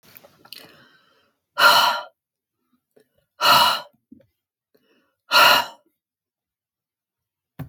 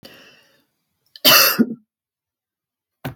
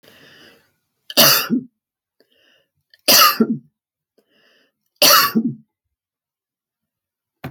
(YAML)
exhalation_length: 7.7 s
exhalation_amplitude: 25258
exhalation_signal_mean_std_ratio: 0.31
cough_length: 3.2 s
cough_amplitude: 32767
cough_signal_mean_std_ratio: 0.3
three_cough_length: 7.5 s
three_cough_amplitude: 32768
three_cough_signal_mean_std_ratio: 0.32
survey_phase: alpha (2021-03-01 to 2021-08-12)
age: 65+
gender: Female
wearing_mask: 'No'
symptom_none: true
smoker_status: Never smoked
respiratory_condition_asthma: false
respiratory_condition_other: false
recruitment_source: REACT
submission_delay: 2 days
covid_test_result: Negative
covid_test_method: RT-qPCR